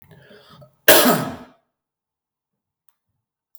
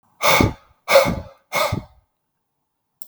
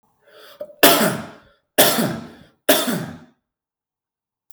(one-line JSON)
{"cough_length": "3.6 s", "cough_amplitude": 32768, "cough_signal_mean_std_ratio": 0.26, "exhalation_length": "3.1 s", "exhalation_amplitude": 32768, "exhalation_signal_mean_std_ratio": 0.41, "three_cough_length": "4.5 s", "three_cough_amplitude": 32768, "three_cough_signal_mean_std_ratio": 0.38, "survey_phase": "beta (2021-08-13 to 2022-03-07)", "age": "18-44", "gender": "Male", "wearing_mask": "No", "symptom_none": true, "smoker_status": "Never smoked", "respiratory_condition_asthma": false, "respiratory_condition_other": false, "recruitment_source": "REACT", "submission_delay": "2 days", "covid_test_result": "Negative", "covid_test_method": "RT-qPCR", "influenza_a_test_result": "Negative", "influenza_b_test_result": "Negative"}